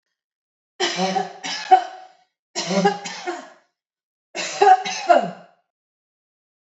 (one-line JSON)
{"three_cough_length": "6.7 s", "three_cough_amplitude": 27492, "three_cough_signal_mean_std_ratio": 0.39, "survey_phase": "alpha (2021-03-01 to 2021-08-12)", "age": "45-64", "gender": "Female", "wearing_mask": "No", "symptom_none": true, "smoker_status": "Ex-smoker", "respiratory_condition_asthma": true, "respiratory_condition_other": false, "recruitment_source": "REACT", "submission_delay": "2 days", "covid_test_result": "Negative", "covid_test_method": "RT-qPCR"}